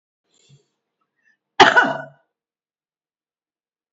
{"cough_length": "3.9 s", "cough_amplitude": 29781, "cough_signal_mean_std_ratio": 0.21, "survey_phase": "beta (2021-08-13 to 2022-03-07)", "age": "65+", "gender": "Female", "wearing_mask": "No", "symptom_cough_any": true, "symptom_runny_or_blocked_nose": true, "symptom_headache": true, "symptom_onset": "6 days", "smoker_status": "Ex-smoker", "respiratory_condition_asthma": false, "respiratory_condition_other": false, "recruitment_source": "Test and Trace", "submission_delay": "1 day", "covid_test_result": "Positive", "covid_test_method": "RT-qPCR", "covid_ct_value": 20.7, "covid_ct_gene": "N gene", "covid_ct_mean": 21.9, "covid_viral_load": "65000 copies/ml", "covid_viral_load_category": "Low viral load (10K-1M copies/ml)"}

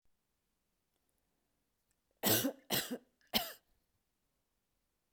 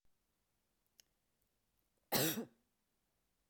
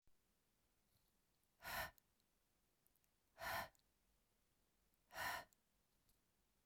{"three_cough_length": "5.1 s", "three_cough_amplitude": 5352, "three_cough_signal_mean_std_ratio": 0.27, "cough_length": "3.5 s", "cough_amplitude": 2942, "cough_signal_mean_std_ratio": 0.24, "exhalation_length": "6.7 s", "exhalation_amplitude": 631, "exhalation_signal_mean_std_ratio": 0.32, "survey_phase": "beta (2021-08-13 to 2022-03-07)", "age": "45-64", "gender": "Female", "wearing_mask": "No", "symptom_none": true, "smoker_status": "Never smoked", "respiratory_condition_asthma": false, "respiratory_condition_other": false, "recruitment_source": "REACT", "submission_delay": "0 days", "covid_test_result": "Negative", "covid_test_method": "RT-qPCR"}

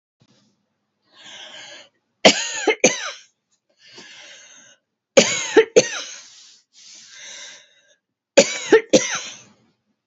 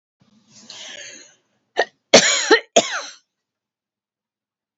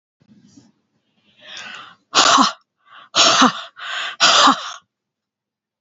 {"three_cough_length": "10.1 s", "three_cough_amplitude": 31197, "three_cough_signal_mean_std_ratio": 0.3, "cough_length": "4.8 s", "cough_amplitude": 32767, "cough_signal_mean_std_ratio": 0.28, "exhalation_length": "5.8 s", "exhalation_amplitude": 32767, "exhalation_signal_mean_std_ratio": 0.4, "survey_phase": "beta (2021-08-13 to 2022-03-07)", "age": "65+", "gender": "Female", "wearing_mask": "No", "symptom_none": true, "smoker_status": "Never smoked", "respiratory_condition_asthma": false, "respiratory_condition_other": false, "recruitment_source": "REACT", "submission_delay": "3 days", "covid_test_result": "Negative", "covid_test_method": "RT-qPCR", "influenza_a_test_result": "Negative", "influenza_b_test_result": "Negative"}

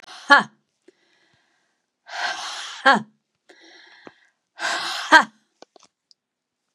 {"exhalation_length": "6.7 s", "exhalation_amplitude": 32768, "exhalation_signal_mean_std_ratio": 0.26, "survey_phase": "beta (2021-08-13 to 2022-03-07)", "age": "45-64", "gender": "Female", "wearing_mask": "No", "symptom_new_continuous_cough": true, "symptom_runny_or_blocked_nose": true, "symptom_shortness_of_breath": true, "symptom_diarrhoea": true, "symptom_fatigue": true, "symptom_onset": "2 days", "smoker_status": "Never smoked", "respiratory_condition_asthma": true, "respiratory_condition_other": false, "recruitment_source": "Test and Trace", "submission_delay": "1 day", "covid_test_result": "Positive", "covid_test_method": "RT-qPCR", "covid_ct_value": 24.4, "covid_ct_gene": "N gene"}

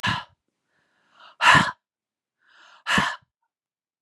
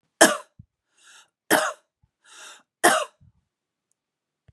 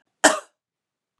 {"exhalation_length": "4.0 s", "exhalation_amplitude": 27610, "exhalation_signal_mean_std_ratio": 0.31, "three_cough_length": "4.5 s", "three_cough_amplitude": 32767, "three_cough_signal_mean_std_ratio": 0.25, "cough_length": "1.2 s", "cough_amplitude": 30236, "cough_signal_mean_std_ratio": 0.23, "survey_phase": "beta (2021-08-13 to 2022-03-07)", "age": "45-64", "gender": "Female", "wearing_mask": "No", "symptom_none": true, "smoker_status": "Never smoked", "respiratory_condition_asthma": false, "respiratory_condition_other": false, "recruitment_source": "REACT", "submission_delay": "1 day", "covid_test_result": "Negative", "covid_test_method": "RT-qPCR", "influenza_a_test_result": "Negative", "influenza_b_test_result": "Negative"}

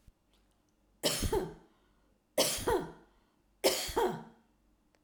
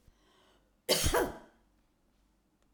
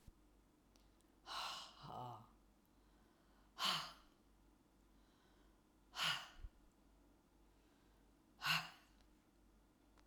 {"three_cough_length": "5.0 s", "three_cough_amplitude": 6754, "three_cough_signal_mean_std_ratio": 0.43, "cough_length": "2.7 s", "cough_amplitude": 6374, "cough_signal_mean_std_ratio": 0.33, "exhalation_length": "10.1 s", "exhalation_amplitude": 1799, "exhalation_signal_mean_std_ratio": 0.36, "survey_phase": "alpha (2021-03-01 to 2021-08-12)", "age": "65+", "gender": "Female", "wearing_mask": "No", "symptom_none": true, "smoker_status": "Ex-smoker", "respiratory_condition_asthma": false, "respiratory_condition_other": false, "recruitment_source": "REACT", "submission_delay": "1 day", "covid_test_result": "Negative", "covid_test_method": "RT-qPCR"}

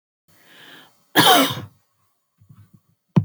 {"cough_length": "3.2 s", "cough_amplitude": 29211, "cough_signal_mean_std_ratio": 0.31, "survey_phase": "beta (2021-08-13 to 2022-03-07)", "age": "45-64", "gender": "Female", "wearing_mask": "No", "symptom_none": true, "smoker_status": "Never smoked", "respiratory_condition_asthma": false, "respiratory_condition_other": false, "recruitment_source": "REACT", "submission_delay": "0 days", "covid_test_result": "Negative", "covid_test_method": "RT-qPCR", "influenza_a_test_result": "Negative", "influenza_b_test_result": "Negative"}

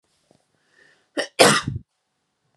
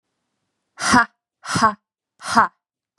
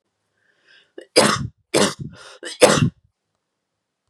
{"cough_length": "2.6 s", "cough_amplitude": 32744, "cough_signal_mean_std_ratio": 0.27, "exhalation_length": "3.0 s", "exhalation_amplitude": 29936, "exhalation_signal_mean_std_ratio": 0.35, "three_cough_length": "4.1 s", "three_cough_amplitude": 32767, "three_cough_signal_mean_std_ratio": 0.33, "survey_phase": "beta (2021-08-13 to 2022-03-07)", "age": "18-44", "gender": "Female", "wearing_mask": "No", "symptom_cough_any": true, "symptom_runny_or_blocked_nose": true, "smoker_status": "Current smoker (1 to 10 cigarettes per day)", "respiratory_condition_asthma": false, "respiratory_condition_other": false, "recruitment_source": "REACT", "submission_delay": "1 day", "covid_test_result": "Negative", "covid_test_method": "RT-qPCR", "influenza_a_test_result": "Negative", "influenza_b_test_result": "Negative"}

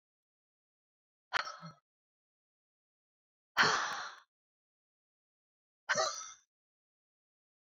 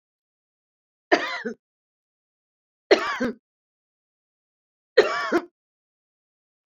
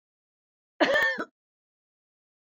{"exhalation_length": "7.8 s", "exhalation_amplitude": 6698, "exhalation_signal_mean_std_ratio": 0.26, "three_cough_length": "6.7 s", "three_cough_amplitude": 26305, "three_cough_signal_mean_std_ratio": 0.26, "cough_length": "2.5 s", "cough_amplitude": 14248, "cough_signal_mean_std_ratio": 0.33, "survey_phase": "beta (2021-08-13 to 2022-03-07)", "age": "65+", "gender": "Female", "wearing_mask": "No", "symptom_none": true, "smoker_status": "Never smoked", "respiratory_condition_asthma": false, "respiratory_condition_other": false, "recruitment_source": "REACT", "submission_delay": "2 days", "covid_test_result": "Negative", "covid_test_method": "RT-qPCR"}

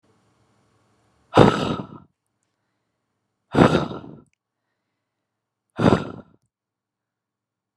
{"exhalation_length": "7.8 s", "exhalation_amplitude": 32768, "exhalation_signal_mean_std_ratio": 0.25, "survey_phase": "beta (2021-08-13 to 2022-03-07)", "age": "18-44", "gender": "Female", "wearing_mask": "No", "symptom_none": true, "smoker_status": "Never smoked", "respiratory_condition_asthma": false, "respiratory_condition_other": false, "recruitment_source": "REACT", "submission_delay": "1 day", "covid_test_result": "Negative", "covid_test_method": "RT-qPCR"}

